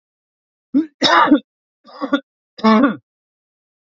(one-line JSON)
{"three_cough_length": "3.9 s", "three_cough_amplitude": 28601, "three_cough_signal_mean_std_ratio": 0.39, "survey_phase": "beta (2021-08-13 to 2022-03-07)", "age": "18-44", "gender": "Male", "wearing_mask": "No", "symptom_none": true, "smoker_status": "Ex-smoker", "respiratory_condition_asthma": false, "respiratory_condition_other": false, "recruitment_source": "REACT", "submission_delay": "2 days", "covid_test_result": "Negative", "covid_test_method": "RT-qPCR", "influenza_a_test_result": "Negative", "influenza_b_test_result": "Negative"}